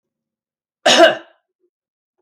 {
  "cough_length": "2.2 s",
  "cough_amplitude": 32111,
  "cough_signal_mean_std_ratio": 0.29,
  "survey_phase": "beta (2021-08-13 to 2022-03-07)",
  "age": "45-64",
  "gender": "Female",
  "wearing_mask": "No",
  "symptom_cough_any": true,
  "symptom_onset": "11 days",
  "smoker_status": "Never smoked",
  "respiratory_condition_asthma": true,
  "respiratory_condition_other": false,
  "recruitment_source": "REACT",
  "submission_delay": "2 days",
  "covid_test_result": "Negative",
  "covid_test_method": "RT-qPCR"
}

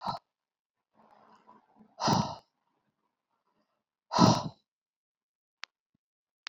{
  "exhalation_length": "6.5 s",
  "exhalation_amplitude": 15539,
  "exhalation_signal_mean_std_ratio": 0.24,
  "survey_phase": "beta (2021-08-13 to 2022-03-07)",
  "age": "65+",
  "gender": "Female",
  "wearing_mask": "No",
  "symptom_cough_any": true,
  "symptom_shortness_of_breath": true,
  "symptom_fatigue": true,
  "symptom_change_to_sense_of_smell_or_taste": true,
  "symptom_loss_of_taste": true,
  "symptom_onset": "9 days",
  "smoker_status": "Never smoked",
  "respiratory_condition_asthma": false,
  "respiratory_condition_other": false,
  "recruitment_source": "Test and Trace",
  "submission_delay": "8 days",
  "covid_test_result": "Positive",
  "covid_test_method": "RT-qPCR",
  "covid_ct_value": 15.4,
  "covid_ct_gene": "ORF1ab gene",
  "covid_ct_mean": 15.6,
  "covid_viral_load": "7600000 copies/ml",
  "covid_viral_load_category": "High viral load (>1M copies/ml)"
}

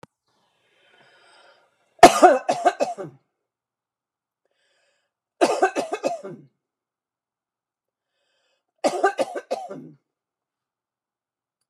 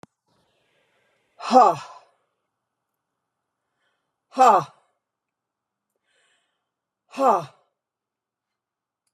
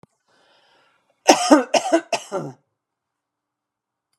{
  "three_cough_length": "11.7 s",
  "three_cough_amplitude": 32768,
  "three_cough_signal_mean_std_ratio": 0.24,
  "exhalation_length": "9.1 s",
  "exhalation_amplitude": 24369,
  "exhalation_signal_mean_std_ratio": 0.23,
  "cough_length": "4.2 s",
  "cough_amplitude": 32768,
  "cough_signal_mean_std_ratio": 0.29,
  "survey_phase": "beta (2021-08-13 to 2022-03-07)",
  "age": "65+",
  "gender": "Female",
  "wearing_mask": "No",
  "symptom_none": true,
  "smoker_status": "Never smoked",
  "respiratory_condition_asthma": false,
  "respiratory_condition_other": false,
  "recruitment_source": "REACT",
  "submission_delay": "2 days",
  "covid_test_result": "Negative",
  "covid_test_method": "RT-qPCR"
}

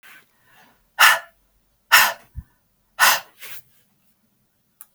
{
  "exhalation_length": "4.9 s",
  "exhalation_amplitude": 32768,
  "exhalation_signal_mean_std_ratio": 0.28,
  "survey_phase": "beta (2021-08-13 to 2022-03-07)",
  "age": "45-64",
  "gender": "Female",
  "wearing_mask": "No",
  "symptom_runny_or_blocked_nose": true,
  "symptom_fatigue": true,
  "symptom_onset": "12 days",
  "smoker_status": "Never smoked",
  "respiratory_condition_asthma": false,
  "respiratory_condition_other": false,
  "recruitment_source": "REACT",
  "submission_delay": "8 days",
  "covid_test_result": "Negative",
  "covid_test_method": "RT-qPCR",
  "influenza_a_test_result": "Negative",
  "influenza_b_test_result": "Negative"
}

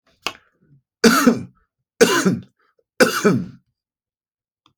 {
  "cough_length": "4.8 s",
  "cough_amplitude": 31987,
  "cough_signal_mean_std_ratio": 0.37,
  "survey_phase": "alpha (2021-03-01 to 2021-08-12)",
  "age": "45-64",
  "gender": "Male",
  "wearing_mask": "No",
  "symptom_none": true,
  "smoker_status": "Never smoked",
  "respiratory_condition_asthma": false,
  "respiratory_condition_other": false,
  "recruitment_source": "REACT",
  "submission_delay": "1 day",
  "covid_test_result": "Negative",
  "covid_test_method": "RT-qPCR"
}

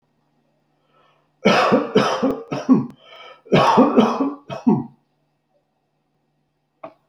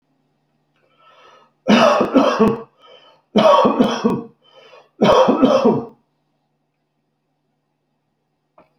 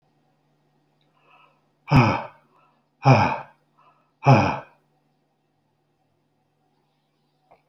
{
  "cough_length": "7.1 s",
  "cough_amplitude": 28369,
  "cough_signal_mean_std_ratio": 0.44,
  "three_cough_length": "8.8 s",
  "three_cough_amplitude": 29169,
  "three_cough_signal_mean_std_ratio": 0.44,
  "exhalation_length": "7.7 s",
  "exhalation_amplitude": 24270,
  "exhalation_signal_mean_std_ratio": 0.27,
  "survey_phase": "alpha (2021-03-01 to 2021-08-12)",
  "age": "65+",
  "gender": "Male",
  "wearing_mask": "No",
  "symptom_none": true,
  "smoker_status": "Ex-smoker",
  "respiratory_condition_asthma": false,
  "respiratory_condition_other": false,
  "recruitment_source": "REACT",
  "submission_delay": "4 days",
  "covid_test_result": "Negative",
  "covid_test_method": "RT-qPCR"
}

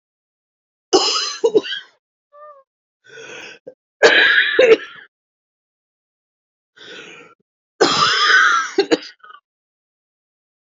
{
  "three_cough_length": "10.7 s",
  "three_cough_amplitude": 30088,
  "three_cough_signal_mean_std_ratio": 0.39,
  "survey_phase": "beta (2021-08-13 to 2022-03-07)",
  "age": "45-64",
  "gender": "Female",
  "wearing_mask": "No",
  "symptom_cough_any": true,
  "symptom_new_continuous_cough": true,
  "symptom_runny_or_blocked_nose": true,
  "symptom_fatigue": true,
  "symptom_fever_high_temperature": true,
  "symptom_headache": true,
  "smoker_status": "Never smoked",
  "respiratory_condition_asthma": true,
  "respiratory_condition_other": false,
  "recruitment_source": "Test and Trace",
  "submission_delay": "2 days",
  "covid_test_result": "Positive",
  "covid_test_method": "LFT"
}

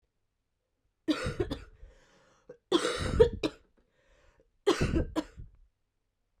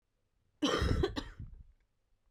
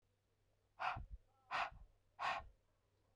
{
  "three_cough_length": "6.4 s",
  "three_cough_amplitude": 11402,
  "three_cough_signal_mean_std_ratio": 0.36,
  "cough_length": "2.3 s",
  "cough_amplitude": 3980,
  "cough_signal_mean_std_ratio": 0.46,
  "exhalation_length": "3.2 s",
  "exhalation_amplitude": 1432,
  "exhalation_signal_mean_std_ratio": 0.41,
  "survey_phase": "beta (2021-08-13 to 2022-03-07)",
  "age": "18-44",
  "gender": "Female",
  "wearing_mask": "No",
  "symptom_cough_any": true,
  "symptom_runny_or_blocked_nose": true,
  "symptom_headache": true,
  "symptom_change_to_sense_of_smell_or_taste": true,
  "symptom_loss_of_taste": true,
  "symptom_onset": "2 days",
  "smoker_status": "Ex-smoker",
  "respiratory_condition_asthma": false,
  "respiratory_condition_other": false,
  "recruitment_source": "Test and Trace",
  "submission_delay": "1 day",
  "covid_test_result": "Positive",
  "covid_test_method": "RT-qPCR",
  "covid_ct_value": 15.7,
  "covid_ct_gene": "ORF1ab gene",
  "covid_ct_mean": 16.5,
  "covid_viral_load": "3900000 copies/ml",
  "covid_viral_load_category": "High viral load (>1M copies/ml)"
}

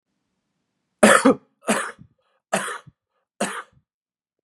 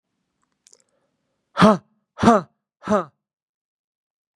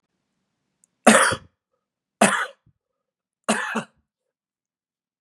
{
  "cough_length": "4.4 s",
  "cough_amplitude": 32767,
  "cough_signal_mean_std_ratio": 0.29,
  "exhalation_length": "4.4 s",
  "exhalation_amplitude": 32119,
  "exhalation_signal_mean_std_ratio": 0.25,
  "three_cough_length": "5.2 s",
  "three_cough_amplitude": 32760,
  "three_cough_signal_mean_std_ratio": 0.27,
  "survey_phase": "beta (2021-08-13 to 2022-03-07)",
  "age": "18-44",
  "gender": "Male",
  "wearing_mask": "No",
  "symptom_cough_any": true,
  "symptom_runny_or_blocked_nose": true,
  "symptom_headache": true,
  "symptom_onset": "5 days",
  "smoker_status": "Current smoker (e-cigarettes or vapes only)",
  "respiratory_condition_asthma": false,
  "respiratory_condition_other": false,
  "recruitment_source": "Test and Trace",
  "submission_delay": "1 day",
  "covid_test_result": "Positive",
  "covid_test_method": "RT-qPCR",
  "covid_ct_value": 15.4,
  "covid_ct_gene": "ORF1ab gene",
  "covid_ct_mean": 15.6,
  "covid_viral_load": "7600000 copies/ml",
  "covid_viral_load_category": "High viral load (>1M copies/ml)"
}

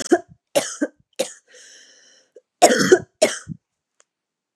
{
  "cough_length": "4.6 s",
  "cough_amplitude": 32572,
  "cough_signal_mean_std_ratio": 0.31,
  "survey_phase": "beta (2021-08-13 to 2022-03-07)",
  "age": "18-44",
  "gender": "Female",
  "wearing_mask": "No",
  "symptom_none": true,
  "symptom_onset": "8 days",
  "smoker_status": "Never smoked",
  "respiratory_condition_asthma": false,
  "respiratory_condition_other": false,
  "recruitment_source": "REACT",
  "submission_delay": "1 day",
  "covid_test_result": "Negative",
  "covid_test_method": "RT-qPCR",
  "influenza_a_test_result": "Negative",
  "influenza_b_test_result": "Negative"
}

